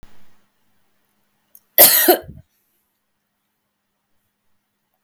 {"cough_length": "5.0 s", "cough_amplitude": 32768, "cough_signal_mean_std_ratio": 0.23, "survey_phase": "beta (2021-08-13 to 2022-03-07)", "age": "45-64", "gender": "Female", "wearing_mask": "No", "symptom_none": true, "smoker_status": "Never smoked", "respiratory_condition_asthma": false, "respiratory_condition_other": false, "recruitment_source": "REACT", "submission_delay": "3 days", "covid_test_result": "Negative", "covid_test_method": "RT-qPCR", "influenza_a_test_result": "Negative", "influenza_b_test_result": "Negative"}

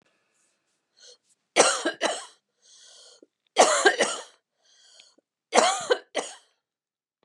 {"three_cough_length": "7.2 s", "three_cough_amplitude": 28922, "three_cough_signal_mean_std_ratio": 0.33, "survey_phase": "beta (2021-08-13 to 2022-03-07)", "age": "65+", "gender": "Female", "wearing_mask": "No", "symptom_none": true, "smoker_status": "Never smoked", "respiratory_condition_asthma": false, "respiratory_condition_other": false, "recruitment_source": "REACT", "submission_delay": "2 days", "covid_test_result": "Negative", "covid_test_method": "RT-qPCR", "influenza_a_test_result": "Negative", "influenza_b_test_result": "Negative"}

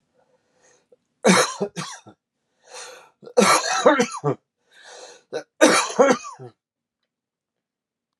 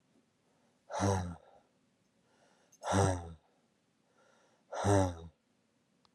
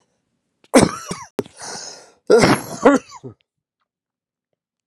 {"three_cough_length": "8.2 s", "three_cough_amplitude": 32767, "three_cough_signal_mean_std_ratio": 0.37, "exhalation_length": "6.1 s", "exhalation_amplitude": 5264, "exhalation_signal_mean_std_ratio": 0.37, "cough_length": "4.9 s", "cough_amplitude": 32767, "cough_signal_mean_std_ratio": 0.32, "survey_phase": "beta (2021-08-13 to 2022-03-07)", "age": "18-44", "gender": "Male", "wearing_mask": "No", "symptom_cough_any": true, "symptom_new_continuous_cough": true, "symptom_runny_or_blocked_nose": true, "symptom_sore_throat": true, "symptom_fatigue": true, "symptom_fever_high_temperature": true, "symptom_other": true, "symptom_onset": "3 days", "smoker_status": "Never smoked", "respiratory_condition_asthma": false, "respiratory_condition_other": false, "recruitment_source": "Test and Trace", "submission_delay": "2 days", "covid_test_result": "Positive", "covid_test_method": "RT-qPCR", "covid_ct_value": 21.1, "covid_ct_gene": "ORF1ab gene", "covid_ct_mean": 21.9, "covid_viral_load": "63000 copies/ml", "covid_viral_load_category": "Low viral load (10K-1M copies/ml)"}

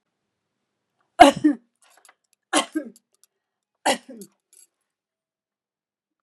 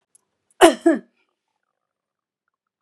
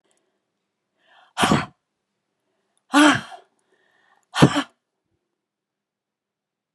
{"three_cough_length": "6.2 s", "three_cough_amplitude": 32768, "three_cough_signal_mean_std_ratio": 0.19, "cough_length": "2.8 s", "cough_amplitude": 32767, "cough_signal_mean_std_ratio": 0.22, "exhalation_length": "6.7 s", "exhalation_amplitude": 32763, "exhalation_signal_mean_std_ratio": 0.24, "survey_phase": "beta (2021-08-13 to 2022-03-07)", "age": "65+", "gender": "Female", "wearing_mask": "No", "symptom_none": true, "smoker_status": "Never smoked", "respiratory_condition_asthma": false, "respiratory_condition_other": false, "recruitment_source": "REACT", "submission_delay": "2 days", "covid_test_result": "Negative", "covid_test_method": "RT-qPCR"}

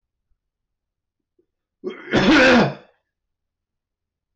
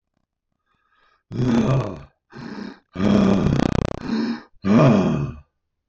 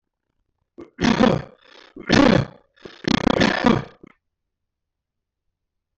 {"cough_length": "4.4 s", "cough_amplitude": 13456, "cough_signal_mean_std_ratio": 0.35, "exhalation_length": "5.9 s", "exhalation_amplitude": 18292, "exhalation_signal_mean_std_ratio": 0.55, "three_cough_length": "6.0 s", "three_cough_amplitude": 17468, "three_cough_signal_mean_std_ratio": 0.36, "survey_phase": "beta (2021-08-13 to 2022-03-07)", "age": "65+", "gender": "Male", "wearing_mask": "No", "symptom_cough_any": true, "symptom_runny_or_blocked_nose": true, "symptom_other": true, "smoker_status": "Ex-smoker", "respiratory_condition_asthma": false, "respiratory_condition_other": false, "recruitment_source": "Test and Trace", "submission_delay": "1 day", "covid_test_result": "Positive", "covid_test_method": "ePCR"}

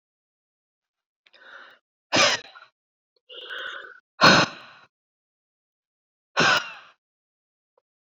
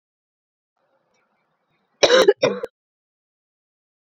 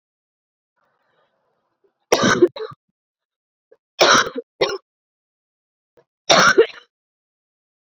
{"exhalation_length": "8.2 s", "exhalation_amplitude": 26494, "exhalation_signal_mean_std_ratio": 0.27, "cough_length": "4.1 s", "cough_amplitude": 29594, "cough_signal_mean_std_ratio": 0.25, "three_cough_length": "7.9 s", "three_cough_amplitude": 31459, "three_cough_signal_mean_std_ratio": 0.29, "survey_phase": "beta (2021-08-13 to 2022-03-07)", "age": "45-64", "gender": "Female", "wearing_mask": "No", "symptom_cough_any": true, "symptom_runny_or_blocked_nose": true, "symptom_abdominal_pain": true, "symptom_fatigue": true, "symptom_headache": true, "symptom_change_to_sense_of_smell_or_taste": true, "symptom_loss_of_taste": true, "symptom_other": true, "symptom_onset": "6 days", "smoker_status": "Never smoked", "respiratory_condition_asthma": false, "respiratory_condition_other": false, "recruitment_source": "Test and Trace", "submission_delay": "2 days", "covid_test_result": "Positive", "covid_test_method": "RT-qPCR"}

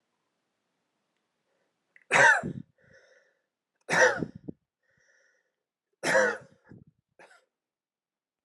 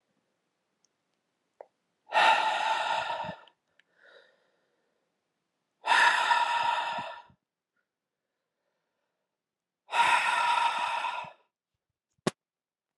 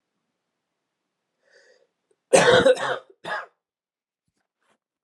{"three_cough_length": "8.4 s", "three_cough_amplitude": 14505, "three_cough_signal_mean_std_ratio": 0.27, "exhalation_length": "13.0 s", "exhalation_amplitude": 10149, "exhalation_signal_mean_std_ratio": 0.43, "cough_length": "5.0 s", "cough_amplitude": 24231, "cough_signal_mean_std_ratio": 0.28, "survey_phase": "beta (2021-08-13 to 2022-03-07)", "age": "18-44", "gender": "Male", "wearing_mask": "No", "symptom_cough_any": true, "symptom_runny_or_blocked_nose": true, "symptom_sore_throat": true, "symptom_fatigue": true, "symptom_fever_high_temperature": true, "symptom_headache": true, "symptom_onset": "3 days", "smoker_status": "Prefer not to say", "respiratory_condition_asthma": true, "respiratory_condition_other": false, "recruitment_source": "Test and Trace", "submission_delay": "2 days", "covid_test_result": "Positive", "covid_test_method": "RT-qPCR"}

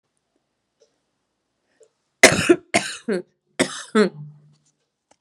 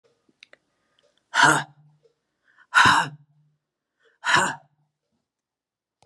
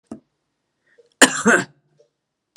{"three_cough_length": "5.2 s", "three_cough_amplitude": 32768, "three_cough_signal_mean_std_ratio": 0.27, "exhalation_length": "6.1 s", "exhalation_amplitude": 26330, "exhalation_signal_mean_std_ratio": 0.3, "cough_length": "2.6 s", "cough_amplitude": 32768, "cough_signal_mean_std_ratio": 0.26, "survey_phase": "beta (2021-08-13 to 2022-03-07)", "age": "45-64", "gender": "Female", "wearing_mask": "No", "symptom_cough_any": true, "symptom_abdominal_pain": true, "symptom_headache": true, "symptom_change_to_sense_of_smell_or_taste": true, "symptom_other": true, "symptom_onset": "9 days", "smoker_status": "Ex-smoker", "respiratory_condition_asthma": false, "respiratory_condition_other": false, "recruitment_source": "REACT", "submission_delay": "2 days", "covid_test_result": "Positive", "covid_test_method": "RT-qPCR", "covid_ct_value": 22.0, "covid_ct_gene": "E gene", "influenza_a_test_result": "Negative", "influenza_b_test_result": "Negative"}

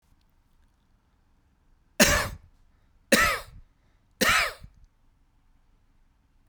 {"three_cough_length": "6.5 s", "three_cough_amplitude": 28292, "three_cough_signal_mean_std_ratio": 0.3, "survey_phase": "beta (2021-08-13 to 2022-03-07)", "age": "45-64", "gender": "Male", "wearing_mask": "No", "symptom_none": true, "smoker_status": "Never smoked", "respiratory_condition_asthma": false, "respiratory_condition_other": false, "recruitment_source": "REACT", "submission_delay": "1 day", "covid_test_result": "Negative", "covid_test_method": "RT-qPCR"}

